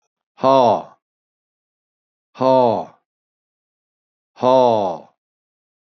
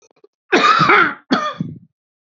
{"exhalation_length": "5.9 s", "exhalation_amplitude": 27964, "exhalation_signal_mean_std_ratio": 0.36, "cough_length": "2.4 s", "cough_amplitude": 27854, "cough_signal_mean_std_ratio": 0.51, "survey_phase": "beta (2021-08-13 to 2022-03-07)", "age": "65+", "gender": "Male", "wearing_mask": "No", "symptom_runny_or_blocked_nose": true, "smoker_status": "Never smoked", "respiratory_condition_asthma": false, "respiratory_condition_other": false, "recruitment_source": "Test and Trace", "submission_delay": "0 days", "covid_test_result": "Negative", "covid_test_method": "LFT"}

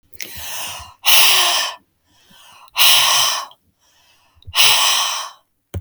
{"exhalation_length": "5.8 s", "exhalation_amplitude": 32768, "exhalation_signal_mean_std_ratio": 0.53, "survey_phase": "beta (2021-08-13 to 2022-03-07)", "age": "18-44", "gender": "Female", "wearing_mask": "No", "symptom_none": true, "smoker_status": "Never smoked", "respiratory_condition_asthma": false, "respiratory_condition_other": false, "recruitment_source": "REACT", "submission_delay": "2 days", "covid_test_result": "Negative", "covid_test_method": "RT-qPCR", "influenza_a_test_result": "Negative", "influenza_b_test_result": "Negative"}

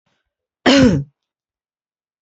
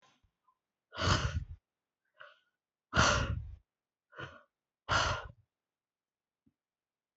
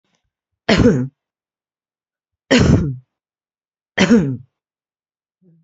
{"cough_length": "2.2 s", "cough_amplitude": 28917, "cough_signal_mean_std_ratio": 0.33, "exhalation_length": "7.2 s", "exhalation_amplitude": 7591, "exhalation_signal_mean_std_ratio": 0.34, "three_cough_length": "5.6 s", "three_cough_amplitude": 31865, "three_cough_signal_mean_std_ratio": 0.36, "survey_phase": "beta (2021-08-13 to 2022-03-07)", "age": "45-64", "gender": "Female", "wearing_mask": "No", "symptom_shortness_of_breath": true, "symptom_sore_throat": true, "symptom_abdominal_pain": true, "symptom_diarrhoea": true, "symptom_fatigue": true, "symptom_fever_high_temperature": true, "symptom_headache": true, "symptom_other": true, "smoker_status": "Current smoker (1 to 10 cigarettes per day)", "respiratory_condition_asthma": false, "respiratory_condition_other": false, "recruitment_source": "Test and Trace", "submission_delay": "2 days", "covid_test_result": "Positive", "covid_test_method": "LFT"}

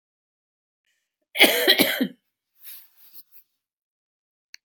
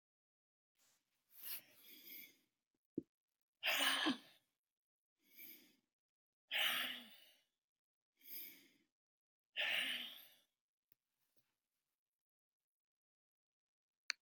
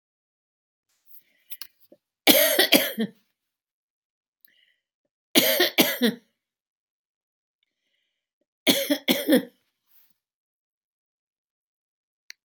{"cough_length": "4.6 s", "cough_amplitude": 29480, "cough_signal_mean_std_ratio": 0.28, "exhalation_length": "14.2 s", "exhalation_amplitude": 3669, "exhalation_signal_mean_std_ratio": 0.3, "three_cough_length": "12.4 s", "three_cough_amplitude": 32767, "three_cough_signal_mean_std_ratio": 0.29, "survey_phase": "beta (2021-08-13 to 2022-03-07)", "age": "65+", "gender": "Female", "wearing_mask": "No", "symptom_none": true, "smoker_status": "Never smoked", "respiratory_condition_asthma": false, "respiratory_condition_other": false, "recruitment_source": "REACT", "submission_delay": "4 days", "covid_test_result": "Negative", "covid_test_method": "RT-qPCR", "influenza_a_test_result": "Negative", "influenza_b_test_result": "Negative"}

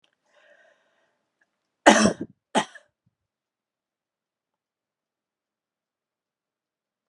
{"cough_length": "7.1 s", "cough_amplitude": 32767, "cough_signal_mean_std_ratio": 0.16, "survey_phase": "alpha (2021-03-01 to 2021-08-12)", "age": "65+", "gender": "Female", "wearing_mask": "No", "symptom_none": true, "smoker_status": "Never smoked", "respiratory_condition_asthma": false, "respiratory_condition_other": false, "recruitment_source": "REACT", "submission_delay": "1 day", "covid_test_result": "Negative", "covid_test_method": "RT-qPCR"}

